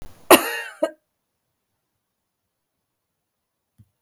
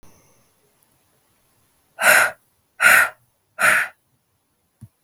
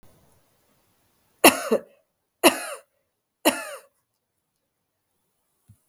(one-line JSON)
{"cough_length": "4.0 s", "cough_amplitude": 32768, "cough_signal_mean_std_ratio": 0.18, "exhalation_length": "5.0 s", "exhalation_amplitude": 32487, "exhalation_signal_mean_std_ratio": 0.33, "three_cough_length": "5.9 s", "three_cough_amplitude": 32766, "three_cough_signal_mean_std_ratio": 0.21, "survey_phase": "beta (2021-08-13 to 2022-03-07)", "age": "45-64", "gender": "Female", "wearing_mask": "Yes", "symptom_fatigue": true, "symptom_change_to_sense_of_smell_or_taste": true, "symptom_other": true, "smoker_status": "Never smoked", "respiratory_condition_asthma": false, "respiratory_condition_other": false, "recruitment_source": "Test and Trace", "submission_delay": "2 days", "covid_test_result": "Positive", "covid_test_method": "RT-qPCR", "covid_ct_value": 25.6, "covid_ct_gene": "ORF1ab gene"}